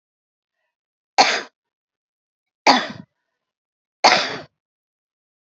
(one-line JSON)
{"three_cough_length": "5.5 s", "three_cough_amplitude": 29156, "three_cough_signal_mean_std_ratio": 0.25, "survey_phase": "beta (2021-08-13 to 2022-03-07)", "age": "65+", "gender": "Female", "wearing_mask": "No", "symptom_cough_any": true, "symptom_fatigue": true, "smoker_status": "Ex-smoker", "respiratory_condition_asthma": false, "respiratory_condition_other": false, "recruitment_source": "REACT", "submission_delay": "1 day", "covid_test_result": "Negative", "covid_test_method": "RT-qPCR"}